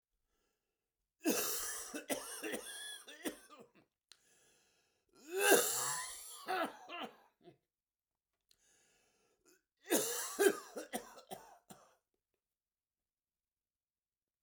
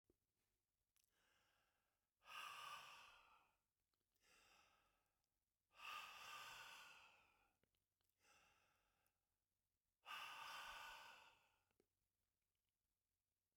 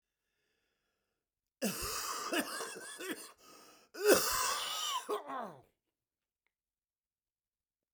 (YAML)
three_cough_length: 14.4 s
three_cough_amplitude: 6133
three_cough_signal_mean_std_ratio: 0.35
exhalation_length: 13.6 s
exhalation_amplitude: 239
exhalation_signal_mean_std_ratio: 0.45
cough_length: 7.9 s
cough_amplitude: 7301
cough_signal_mean_std_ratio: 0.42
survey_phase: beta (2021-08-13 to 2022-03-07)
age: 65+
gender: Male
wearing_mask: 'No'
symptom_cough_any: true
symptom_fatigue: true
smoker_status: Never smoked
respiratory_condition_asthma: false
respiratory_condition_other: false
recruitment_source: Test and Trace
submission_delay: 1 day
covid_test_result: Positive
covid_test_method: RT-qPCR
covid_ct_value: 19.0
covid_ct_gene: ORF1ab gene
covid_ct_mean: 19.3
covid_viral_load: 450000 copies/ml
covid_viral_load_category: Low viral load (10K-1M copies/ml)